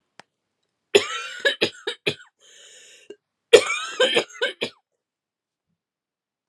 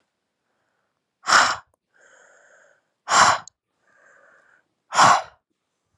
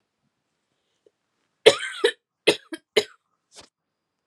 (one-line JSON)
{"cough_length": "6.5 s", "cough_amplitude": 32768, "cough_signal_mean_std_ratio": 0.29, "exhalation_length": "6.0 s", "exhalation_amplitude": 28170, "exhalation_signal_mean_std_ratio": 0.29, "three_cough_length": "4.3 s", "three_cough_amplitude": 32745, "three_cough_signal_mean_std_ratio": 0.21, "survey_phase": "alpha (2021-03-01 to 2021-08-12)", "age": "18-44", "gender": "Female", "wearing_mask": "No", "symptom_cough_any": true, "symptom_new_continuous_cough": true, "symptom_shortness_of_breath": true, "symptom_fatigue": true, "symptom_fever_high_temperature": true, "symptom_headache": true, "symptom_change_to_sense_of_smell_or_taste": true, "symptom_loss_of_taste": true, "smoker_status": "Current smoker (e-cigarettes or vapes only)", "respiratory_condition_asthma": true, "respiratory_condition_other": false, "recruitment_source": "Test and Trace", "submission_delay": "2 days", "covid_test_result": "Positive", "covid_test_method": "RT-qPCR"}